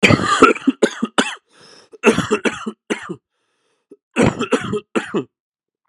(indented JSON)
{
  "cough_length": "5.9 s",
  "cough_amplitude": 32768,
  "cough_signal_mean_std_ratio": 0.43,
  "survey_phase": "beta (2021-08-13 to 2022-03-07)",
  "age": "18-44",
  "gender": "Male",
  "wearing_mask": "No",
  "symptom_cough_any": true,
  "symptom_runny_or_blocked_nose": true,
  "symptom_headache": true,
  "symptom_onset": "3 days",
  "smoker_status": "Current smoker (1 to 10 cigarettes per day)",
  "respiratory_condition_asthma": false,
  "respiratory_condition_other": false,
  "recruitment_source": "Test and Trace",
  "submission_delay": "1 day",
  "covid_test_result": "Positive",
  "covid_test_method": "ePCR"
}